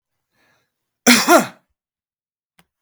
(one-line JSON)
{"cough_length": "2.8 s", "cough_amplitude": 32768, "cough_signal_mean_std_ratio": 0.27, "survey_phase": "beta (2021-08-13 to 2022-03-07)", "age": "65+", "gender": "Male", "wearing_mask": "No", "symptom_none": true, "smoker_status": "Never smoked", "respiratory_condition_asthma": false, "respiratory_condition_other": false, "recruitment_source": "REACT", "submission_delay": "3 days", "covid_test_result": "Negative", "covid_test_method": "RT-qPCR"}